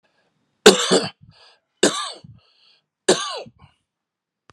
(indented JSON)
{
  "three_cough_length": "4.5 s",
  "three_cough_amplitude": 32768,
  "three_cough_signal_mean_std_ratio": 0.28,
  "survey_phase": "alpha (2021-03-01 to 2021-08-12)",
  "age": "45-64",
  "gender": "Male",
  "wearing_mask": "No",
  "symptom_none": true,
  "smoker_status": "Never smoked",
  "respiratory_condition_asthma": false,
  "respiratory_condition_other": true,
  "recruitment_source": "REACT",
  "submission_delay": "1 day",
  "covid_test_result": "Negative",
  "covid_test_method": "RT-qPCR"
}